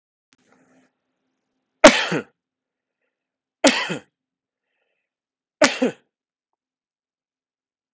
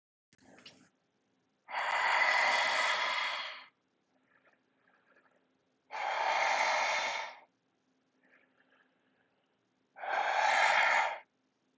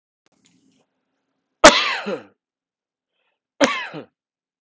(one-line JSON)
{"three_cough_length": "7.9 s", "three_cough_amplitude": 32768, "three_cough_signal_mean_std_ratio": 0.2, "exhalation_length": "11.8 s", "exhalation_amplitude": 5350, "exhalation_signal_mean_std_ratio": 0.52, "cough_length": "4.6 s", "cough_amplitude": 32768, "cough_signal_mean_std_ratio": 0.23, "survey_phase": "beta (2021-08-13 to 2022-03-07)", "age": "18-44", "gender": "Male", "wearing_mask": "No", "symptom_sore_throat": true, "smoker_status": "Never smoked", "respiratory_condition_asthma": false, "respiratory_condition_other": false, "recruitment_source": "REACT", "submission_delay": "2 days", "covid_test_result": "Negative", "covid_test_method": "RT-qPCR"}